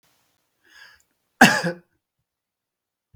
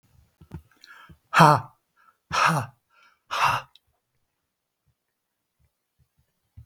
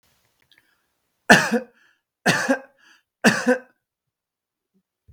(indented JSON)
{
  "cough_length": "3.2 s",
  "cough_amplitude": 32768,
  "cough_signal_mean_std_ratio": 0.2,
  "exhalation_length": "6.7 s",
  "exhalation_amplitude": 32766,
  "exhalation_signal_mean_std_ratio": 0.26,
  "three_cough_length": "5.1 s",
  "three_cough_amplitude": 32766,
  "three_cough_signal_mean_std_ratio": 0.3,
  "survey_phase": "beta (2021-08-13 to 2022-03-07)",
  "age": "45-64",
  "gender": "Male",
  "wearing_mask": "No",
  "symptom_none": true,
  "smoker_status": "Never smoked",
  "respiratory_condition_asthma": false,
  "respiratory_condition_other": false,
  "recruitment_source": "REACT",
  "submission_delay": "1 day",
  "covid_test_result": "Negative",
  "covid_test_method": "RT-qPCR",
  "influenza_a_test_result": "Negative",
  "influenza_b_test_result": "Negative"
}